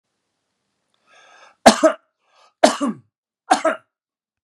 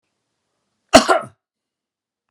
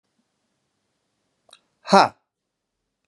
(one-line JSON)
{"three_cough_length": "4.4 s", "three_cough_amplitude": 32768, "three_cough_signal_mean_std_ratio": 0.26, "cough_length": "2.3 s", "cough_amplitude": 32768, "cough_signal_mean_std_ratio": 0.22, "exhalation_length": "3.1 s", "exhalation_amplitude": 31484, "exhalation_signal_mean_std_ratio": 0.16, "survey_phase": "beta (2021-08-13 to 2022-03-07)", "age": "45-64", "gender": "Male", "wearing_mask": "No", "symptom_cough_any": true, "symptom_runny_or_blocked_nose": true, "symptom_shortness_of_breath": true, "symptom_sore_throat": true, "symptom_diarrhoea": true, "symptom_fatigue": true, "symptom_headache": true, "symptom_change_to_sense_of_smell_or_taste": true, "symptom_loss_of_taste": true, "symptom_onset": "2 days", "smoker_status": "Never smoked", "respiratory_condition_asthma": false, "respiratory_condition_other": false, "recruitment_source": "Test and Trace", "submission_delay": "2 days", "covid_test_result": "Positive", "covid_test_method": "RT-qPCR", "covid_ct_value": 14.9, "covid_ct_gene": "ORF1ab gene", "covid_ct_mean": 15.3, "covid_viral_load": "9600000 copies/ml", "covid_viral_load_category": "High viral load (>1M copies/ml)"}